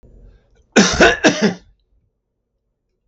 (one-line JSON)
{"cough_length": "3.1 s", "cough_amplitude": 32768, "cough_signal_mean_std_ratio": 0.36, "survey_phase": "beta (2021-08-13 to 2022-03-07)", "age": "65+", "gender": "Male", "wearing_mask": "No", "symptom_none": true, "symptom_onset": "12 days", "smoker_status": "Never smoked", "respiratory_condition_asthma": false, "respiratory_condition_other": false, "recruitment_source": "REACT", "submission_delay": "1 day", "covid_test_result": "Negative", "covid_test_method": "RT-qPCR", "influenza_a_test_result": "Negative", "influenza_b_test_result": "Negative"}